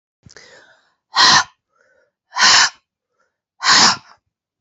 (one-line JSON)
{"exhalation_length": "4.6 s", "exhalation_amplitude": 32629, "exhalation_signal_mean_std_ratio": 0.38, "survey_phase": "beta (2021-08-13 to 2022-03-07)", "age": "18-44", "gender": "Female", "wearing_mask": "No", "symptom_cough_any": true, "symptom_runny_or_blocked_nose": true, "symptom_diarrhoea": true, "symptom_fatigue": true, "symptom_headache": true, "symptom_change_to_sense_of_smell_or_taste": true, "symptom_onset": "2 days", "smoker_status": "Never smoked", "respiratory_condition_asthma": false, "respiratory_condition_other": false, "recruitment_source": "Test and Trace", "submission_delay": "1 day", "covid_test_result": "Positive", "covid_test_method": "RT-qPCR"}